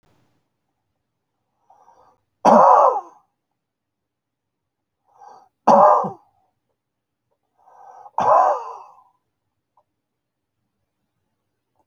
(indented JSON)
{
  "three_cough_length": "11.9 s",
  "three_cough_amplitude": 27565,
  "three_cough_signal_mean_std_ratio": 0.27,
  "survey_phase": "beta (2021-08-13 to 2022-03-07)",
  "age": "65+",
  "gender": "Male",
  "wearing_mask": "No",
  "symptom_fatigue": true,
  "smoker_status": "Never smoked",
  "respiratory_condition_asthma": false,
  "respiratory_condition_other": false,
  "recruitment_source": "REACT",
  "submission_delay": "2 days",
  "covid_test_result": "Negative",
  "covid_test_method": "RT-qPCR"
}